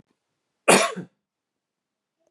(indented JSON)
{
  "cough_length": "2.3 s",
  "cough_amplitude": 27222,
  "cough_signal_mean_std_ratio": 0.24,
  "survey_phase": "beta (2021-08-13 to 2022-03-07)",
  "age": "18-44",
  "gender": "Male",
  "wearing_mask": "No",
  "symptom_runny_or_blocked_nose": true,
  "smoker_status": "Ex-smoker",
  "respiratory_condition_asthma": false,
  "respiratory_condition_other": false,
  "recruitment_source": "REACT",
  "submission_delay": "1 day",
  "covid_test_result": "Negative",
  "covid_test_method": "RT-qPCR",
  "covid_ct_value": 38.8,
  "covid_ct_gene": "N gene",
  "influenza_a_test_result": "Negative",
  "influenza_b_test_result": "Negative"
}